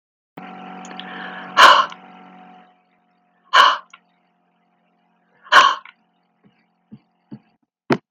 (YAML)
exhalation_length: 8.1 s
exhalation_amplitude: 32768
exhalation_signal_mean_std_ratio: 0.28
survey_phase: alpha (2021-03-01 to 2021-08-12)
age: 65+
gender: Female
wearing_mask: 'No'
symptom_none: true
smoker_status: Never smoked
respiratory_condition_asthma: false
respiratory_condition_other: true
recruitment_source: REACT
submission_delay: 2 days
covid_test_result: Negative
covid_test_method: RT-qPCR